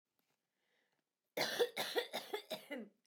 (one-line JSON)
{"cough_length": "3.1 s", "cough_amplitude": 2604, "cough_signal_mean_std_ratio": 0.44, "survey_phase": "beta (2021-08-13 to 2022-03-07)", "age": "45-64", "gender": "Female", "wearing_mask": "No", "symptom_none": true, "symptom_onset": "5 days", "smoker_status": "Ex-smoker", "respiratory_condition_asthma": false, "respiratory_condition_other": false, "recruitment_source": "REACT", "submission_delay": "2 days", "covid_test_result": "Negative", "covid_test_method": "RT-qPCR", "influenza_a_test_result": "Negative", "influenza_b_test_result": "Negative"}